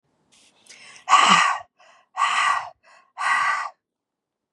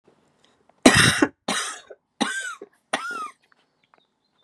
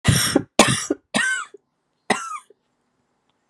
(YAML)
exhalation_length: 4.5 s
exhalation_amplitude: 28930
exhalation_signal_mean_std_ratio: 0.46
three_cough_length: 4.4 s
three_cough_amplitude: 32767
three_cough_signal_mean_std_ratio: 0.34
cough_length: 3.5 s
cough_amplitude: 32768
cough_signal_mean_std_ratio: 0.42
survey_phase: beta (2021-08-13 to 2022-03-07)
age: 45-64
gender: Female
wearing_mask: 'Yes'
symptom_cough_any: true
symptom_new_continuous_cough: true
symptom_runny_or_blocked_nose: true
symptom_sore_throat: true
symptom_fatigue: true
symptom_headache: true
smoker_status: Never smoked
respiratory_condition_asthma: false
respiratory_condition_other: false
recruitment_source: Test and Trace
submission_delay: 0 days
covid_test_result: Positive
covid_test_method: LFT